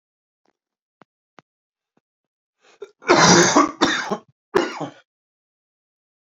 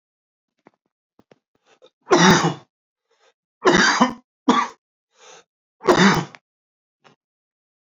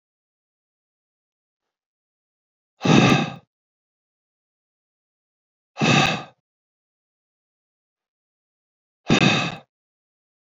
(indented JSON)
{
  "cough_length": "6.4 s",
  "cough_amplitude": 32767,
  "cough_signal_mean_std_ratio": 0.31,
  "three_cough_length": "7.9 s",
  "three_cough_amplitude": 28384,
  "three_cough_signal_mean_std_ratio": 0.33,
  "exhalation_length": "10.4 s",
  "exhalation_amplitude": 27705,
  "exhalation_signal_mean_std_ratio": 0.27,
  "survey_phase": "alpha (2021-03-01 to 2021-08-12)",
  "age": "18-44",
  "gender": "Male",
  "wearing_mask": "No",
  "symptom_cough_any": true,
  "symptom_shortness_of_breath": true,
  "symptom_fatigue": true,
  "symptom_change_to_sense_of_smell_or_taste": true,
  "symptom_loss_of_taste": true,
  "smoker_status": "Never smoked",
  "respiratory_condition_asthma": false,
  "respiratory_condition_other": false,
  "recruitment_source": "Test and Trace",
  "submission_delay": "1 day",
  "covid_test_result": "Positive",
  "covid_test_method": "RT-qPCR"
}